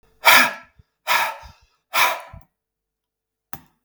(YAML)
exhalation_length: 3.8 s
exhalation_amplitude: 32768
exhalation_signal_mean_std_ratio: 0.34
survey_phase: beta (2021-08-13 to 2022-03-07)
age: 65+
gender: Male
wearing_mask: 'No'
symptom_runny_or_blocked_nose: true
smoker_status: Ex-smoker
respiratory_condition_asthma: false
respiratory_condition_other: false
recruitment_source: REACT
submission_delay: 2 days
covid_test_result: Negative
covid_test_method: RT-qPCR
influenza_a_test_result: Negative
influenza_b_test_result: Negative